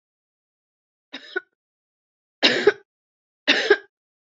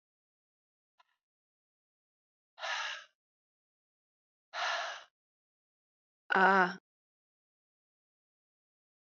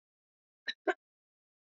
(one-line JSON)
{"three_cough_length": "4.4 s", "three_cough_amplitude": 26287, "three_cough_signal_mean_std_ratio": 0.26, "exhalation_length": "9.1 s", "exhalation_amplitude": 7635, "exhalation_signal_mean_std_ratio": 0.23, "cough_length": "1.7 s", "cough_amplitude": 4367, "cough_signal_mean_std_ratio": 0.17, "survey_phase": "beta (2021-08-13 to 2022-03-07)", "age": "45-64", "gender": "Female", "wearing_mask": "No", "symptom_cough_any": true, "symptom_sore_throat": true, "symptom_fatigue": true, "symptom_headache": true, "symptom_onset": "3 days", "smoker_status": "Ex-smoker", "respiratory_condition_asthma": false, "respiratory_condition_other": false, "recruitment_source": "Test and Trace", "submission_delay": "1 day", "covid_test_result": "Positive", "covid_test_method": "RT-qPCR", "covid_ct_value": 20.9, "covid_ct_gene": "ORF1ab gene", "covid_ct_mean": 21.3, "covid_viral_load": "100000 copies/ml", "covid_viral_load_category": "Low viral load (10K-1M copies/ml)"}